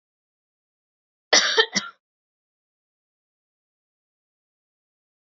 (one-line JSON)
{"cough_length": "5.4 s", "cough_amplitude": 28301, "cough_signal_mean_std_ratio": 0.19, "survey_phase": "beta (2021-08-13 to 2022-03-07)", "age": "18-44", "gender": "Female", "wearing_mask": "No", "symptom_cough_any": true, "symptom_new_continuous_cough": true, "symptom_runny_or_blocked_nose": true, "symptom_shortness_of_breath": true, "symptom_fatigue": true, "symptom_headache": true, "symptom_onset": "4 days", "smoker_status": "Never smoked", "respiratory_condition_asthma": true, "respiratory_condition_other": false, "recruitment_source": "REACT", "submission_delay": "1 day", "covid_test_result": "Positive", "covid_test_method": "RT-qPCR", "covid_ct_value": 18.0, "covid_ct_gene": "E gene", "influenza_a_test_result": "Negative", "influenza_b_test_result": "Negative"}